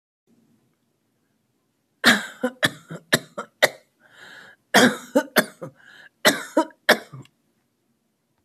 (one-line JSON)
{"three_cough_length": "8.4 s", "three_cough_amplitude": 26827, "three_cough_signal_mean_std_ratio": 0.29, "survey_phase": "alpha (2021-03-01 to 2021-08-12)", "age": "45-64", "gender": "Male", "wearing_mask": "No", "symptom_none": true, "smoker_status": "Ex-smoker", "respiratory_condition_asthma": false, "respiratory_condition_other": false, "recruitment_source": "REACT", "submission_delay": "1 day", "covid_test_result": "Negative", "covid_test_method": "RT-qPCR"}